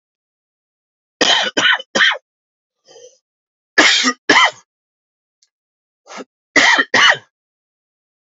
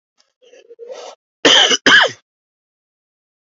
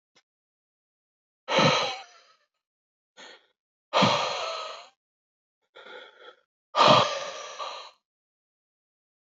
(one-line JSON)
{"three_cough_length": "8.4 s", "three_cough_amplitude": 32352, "three_cough_signal_mean_std_ratio": 0.38, "cough_length": "3.6 s", "cough_amplitude": 30364, "cough_signal_mean_std_ratio": 0.34, "exhalation_length": "9.2 s", "exhalation_amplitude": 18520, "exhalation_signal_mean_std_ratio": 0.33, "survey_phase": "beta (2021-08-13 to 2022-03-07)", "age": "18-44", "gender": "Male", "wearing_mask": "No", "symptom_cough_any": true, "symptom_abdominal_pain": true, "symptom_fatigue": true, "symptom_fever_high_temperature": true, "symptom_other": true, "symptom_onset": "4 days", "smoker_status": "Ex-smoker", "respiratory_condition_asthma": false, "respiratory_condition_other": false, "recruitment_source": "Test and Trace", "submission_delay": "2 days", "covid_test_result": "Positive", "covid_test_method": "RT-qPCR"}